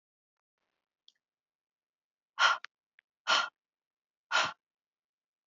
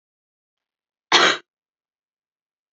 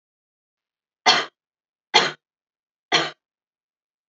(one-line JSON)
{"exhalation_length": "5.5 s", "exhalation_amplitude": 9177, "exhalation_signal_mean_std_ratio": 0.24, "cough_length": "2.7 s", "cough_amplitude": 28771, "cough_signal_mean_std_ratio": 0.23, "three_cough_length": "4.1 s", "three_cough_amplitude": 29566, "three_cough_signal_mean_std_ratio": 0.25, "survey_phase": "beta (2021-08-13 to 2022-03-07)", "age": "18-44", "gender": "Female", "wearing_mask": "No", "symptom_runny_or_blocked_nose": true, "symptom_onset": "5 days", "smoker_status": "Never smoked", "respiratory_condition_asthma": false, "respiratory_condition_other": false, "recruitment_source": "REACT", "submission_delay": "1 day", "covid_test_result": "Negative", "covid_test_method": "RT-qPCR", "influenza_a_test_result": "Negative", "influenza_b_test_result": "Negative"}